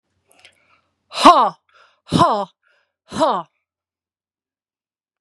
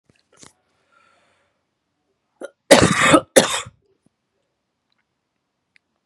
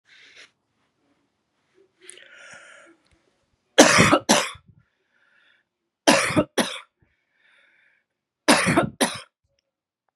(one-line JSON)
{"exhalation_length": "5.2 s", "exhalation_amplitude": 32768, "exhalation_signal_mean_std_ratio": 0.29, "cough_length": "6.1 s", "cough_amplitude": 32768, "cough_signal_mean_std_ratio": 0.25, "three_cough_length": "10.2 s", "three_cough_amplitude": 32767, "three_cough_signal_mean_std_ratio": 0.3, "survey_phase": "beta (2021-08-13 to 2022-03-07)", "age": "45-64", "gender": "Female", "wearing_mask": "No", "symptom_cough_any": true, "symptom_new_continuous_cough": true, "symptom_runny_or_blocked_nose": true, "symptom_sore_throat": true, "symptom_fever_high_temperature": true, "symptom_headache": true, "symptom_onset": "4 days", "smoker_status": "Ex-smoker", "respiratory_condition_asthma": false, "respiratory_condition_other": false, "recruitment_source": "Test and Trace", "submission_delay": "1 day", "covid_test_result": "Positive", "covid_test_method": "ePCR"}